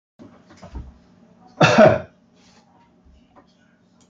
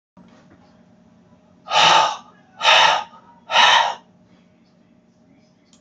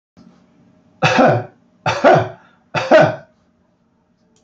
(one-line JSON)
{"cough_length": "4.1 s", "cough_amplitude": 27665, "cough_signal_mean_std_ratio": 0.27, "exhalation_length": "5.8 s", "exhalation_amplitude": 29018, "exhalation_signal_mean_std_ratio": 0.39, "three_cough_length": "4.4 s", "three_cough_amplitude": 29206, "three_cough_signal_mean_std_ratio": 0.41, "survey_phase": "beta (2021-08-13 to 2022-03-07)", "age": "65+", "gender": "Male", "wearing_mask": "No", "symptom_none": true, "smoker_status": "Ex-smoker", "respiratory_condition_asthma": false, "respiratory_condition_other": false, "recruitment_source": "REACT", "submission_delay": "1 day", "covid_test_result": "Negative", "covid_test_method": "RT-qPCR"}